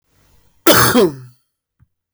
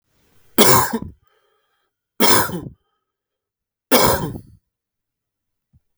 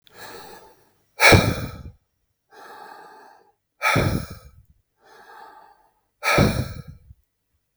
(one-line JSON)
{"cough_length": "2.1 s", "cough_amplitude": 32672, "cough_signal_mean_std_ratio": 0.4, "three_cough_length": "6.0 s", "three_cough_amplitude": 32672, "three_cough_signal_mean_std_ratio": 0.34, "exhalation_length": "7.8 s", "exhalation_amplitude": 32672, "exhalation_signal_mean_std_ratio": 0.33, "survey_phase": "beta (2021-08-13 to 2022-03-07)", "age": "45-64", "gender": "Male", "wearing_mask": "No", "symptom_none": true, "smoker_status": "Never smoked", "respiratory_condition_asthma": false, "respiratory_condition_other": false, "recruitment_source": "REACT", "submission_delay": "1 day", "covid_test_result": "Negative", "covid_test_method": "RT-qPCR", "influenza_a_test_result": "Unknown/Void", "influenza_b_test_result": "Unknown/Void"}